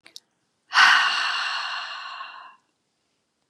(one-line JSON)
{"exhalation_length": "3.5 s", "exhalation_amplitude": 24010, "exhalation_signal_mean_std_ratio": 0.44, "survey_phase": "beta (2021-08-13 to 2022-03-07)", "age": "45-64", "gender": "Female", "wearing_mask": "No", "symptom_none": true, "symptom_onset": "13 days", "smoker_status": "Never smoked", "respiratory_condition_asthma": false, "respiratory_condition_other": false, "recruitment_source": "REACT", "submission_delay": "1 day", "covid_test_result": "Negative", "covid_test_method": "RT-qPCR", "influenza_a_test_result": "Negative", "influenza_b_test_result": "Negative"}